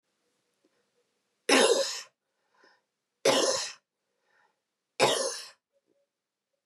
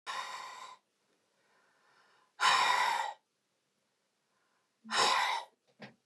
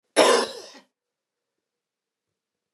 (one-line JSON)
{"three_cough_length": "6.7 s", "three_cough_amplitude": 11121, "three_cough_signal_mean_std_ratio": 0.34, "exhalation_length": "6.1 s", "exhalation_amplitude": 7009, "exhalation_signal_mean_std_ratio": 0.42, "cough_length": "2.7 s", "cough_amplitude": 24539, "cough_signal_mean_std_ratio": 0.27, "survey_phase": "beta (2021-08-13 to 2022-03-07)", "age": "45-64", "gender": "Female", "wearing_mask": "No", "symptom_cough_any": true, "symptom_runny_or_blocked_nose": true, "symptom_headache": true, "symptom_onset": "3 days", "smoker_status": "Never smoked", "respiratory_condition_asthma": false, "respiratory_condition_other": false, "recruitment_source": "Test and Trace", "submission_delay": "2 days", "covid_test_result": "Positive", "covid_test_method": "RT-qPCR", "covid_ct_value": 29.7, "covid_ct_gene": "N gene"}